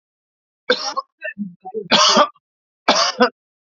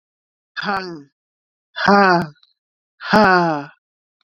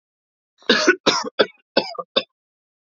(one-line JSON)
{"three_cough_length": "3.7 s", "three_cough_amplitude": 32767, "three_cough_signal_mean_std_ratio": 0.43, "exhalation_length": "4.3 s", "exhalation_amplitude": 28516, "exhalation_signal_mean_std_ratio": 0.41, "cough_length": "2.9 s", "cough_amplitude": 30637, "cough_signal_mean_std_ratio": 0.35, "survey_phase": "alpha (2021-03-01 to 2021-08-12)", "age": "18-44", "gender": "Male", "wearing_mask": "No", "symptom_none": true, "smoker_status": "Never smoked", "respiratory_condition_asthma": false, "respiratory_condition_other": false, "recruitment_source": "REACT", "submission_delay": "1 day", "covid_test_result": "Negative", "covid_test_method": "RT-qPCR"}